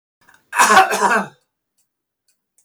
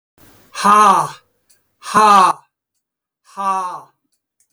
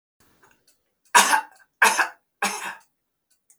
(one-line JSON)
{"cough_length": "2.6 s", "cough_amplitude": 28480, "cough_signal_mean_std_ratio": 0.39, "exhalation_length": "4.5 s", "exhalation_amplitude": 32344, "exhalation_signal_mean_std_ratio": 0.42, "three_cough_length": "3.6 s", "three_cough_amplitude": 26573, "three_cough_signal_mean_std_ratio": 0.32, "survey_phase": "beta (2021-08-13 to 2022-03-07)", "age": "65+", "gender": "Male", "wearing_mask": "No", "symptom_runny_or_blocked_nose": true, "symptom_shortness_of_breath": true, "symptom_sore_throat": true, "symptom_headache": true, "smoker_status": "Never smoked", "respiratory_condition_asthma": true, "respiratory_condition_other": false, "recruitment_source": "REACT", "submission_delay": "3 days", "covid_test_result": "Negative", "covid_test_method": "RT-qPCR"}